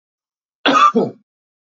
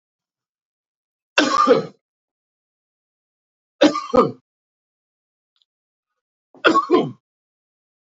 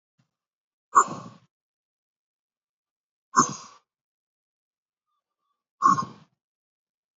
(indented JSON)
{
  "cough_length": "1.6 s",
  "cough_amplitude": 29212,
  "cough_signal_mean_std_ratio": 0.42,
  "three_cough_length": "8.1 s",
  "three_cough_amplitude": 29736,
  "three_cough_signal_mean_std_ratio": 0.29,
  "exhalation_length": "7.2 s",
  "exhalation_amplitude": 22122,
  "exhalation_signal_mean_std_ratio": 0.2,
  "survey_phase": "beta (2021-08-13 to 2022-03-07)",
  "age": "45-64",
  "gender": "Male",
  "wearing_mask": "No",
  "symptom_runny_or_blocked_nose": true,
  "smoker_status": "Never smoked",
  "respiratory_condition_asthma": false,
  "respiratory_condition_other": false,
  "recruitment_source": "REACT",
  "submission_delay": "31 days",
  "covid_test_result": "Negative",
  "covid_test_method": "RT-qPCR",
  "influenza_a_test_result": "Unknown/Void",
  "influenza_b_test_result": "Unknown/Void"
}